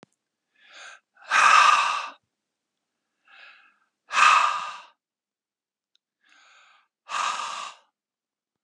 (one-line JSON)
{"exhalation_length": "8.6 s", "exhalation_amplitude": 20729, "exhalation_signal_mean_std_ratio": 0.34, "survey_phase": "beta (2021-08-13 to 2022-03-07)", "age": "45-64", "gender": "Male", "wearing_mask": "No", "symptom_cough_any": true, "smoker_status": "Never smoked", "respiratory_condition_asthma": false, "respiratory_condition_other": false, "recruitment_source": "Test and Trace", "submission_delay": "2 days", "covid_test_result": "Positive", "covid_test_method": "RT-qPCR"}